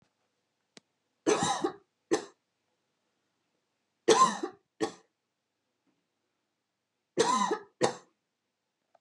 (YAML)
three_cough_length: 9.0 s
three_cough_amplitude: 13286
three_cough_signal_mean_std_ratio: 0.3
survey_phase: beta (2021-08-13 to 2022-03-07)
age: 18-44
gender: Female
wearing_mask: 'No'
symptom_shortness_of_breath: true
smoker_status: Never smoked
respiratory_condition_asthma: false
respiratory_condition_other: false
recruitment_source: REACT
submission_delay: 3 days
covid_test_result: Negative
covid_test_method: RT-qPCR
influenza_a_test_result: Negative
influenza_b_test_result: Negative